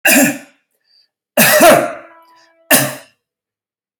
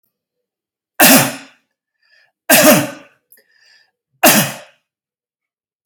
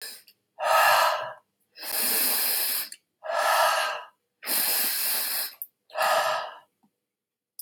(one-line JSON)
{"cough_length": "4.0 s", "cough_amplitude": 32768, "cough_signal_mean_std_ratio": 0.44, "three_cough_length": "5.9 s", "three_cough_amplitude": 32768, "three_cough_signal_mean_std_ratio": 0.33, "exhalation_length": "7.6 s", "exhalation_amplitude": 15116, "exhalation_signal_mean_std_ratio": 0.66, "survey_phase": "alpha (2021-03-01 to 2021-08-12)", "age": "65+", "gender": "Male", "wearing_mask": "No", "symptom_cough_any": true, "symptom_onset": "7 days", "smoker_status": "Never smoked", "respiratory_condition_asthma": false, "respiratory_condition_other": false, "recruitment_source": "REACT", "submission_delay": "1 day", "covid_test_result": "Negative", "covid_test_method": "RT-qPCR"}